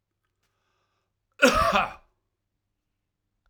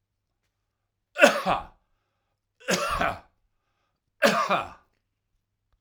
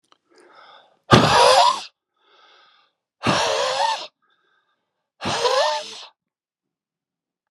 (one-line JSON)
{"cough_length": "3.5 s", "cough_amplitude": 23688, "cough_signal_mean_std_ratio": 0.27, "three_cough_length": "5.8 s", "three_cough_amplitude": 25856, "three_cough_signal_mean_std_ratio": 0.33, "exhalation_length": "7.5 s", "exhalation_amplitude": 32768, "exhalation_signal_mean_std_ratio": 0.41, "survey_phase": "alpha (2021-03-01 to 2021-08-12)", "age": "65+", "gender": "Male", "wearing_mask": "No", "symptom_shortness_of_breath": true, "symptom_fatigue": true, "symptom_fever_high_temperature": true, "symptom_headache": true, "smoker_status": "Never smoked", "respiratory_condition_asthma": false, "respiratory_condition_other": false, "recruitment_source": "Test and Trace", "submission_delay": "2 days", "covid_test_result": "Positive", "covid_test_method": "RT-qPCR", "covid_ct_value": 16.5, "covid_ct_gene": "ORF1ab gene", "covid_ct_mean": 16.6, "covid_viral_load": "3500000 copies/ml", "covid_viral_load_category": "High viral load (>1M copies/ml)"}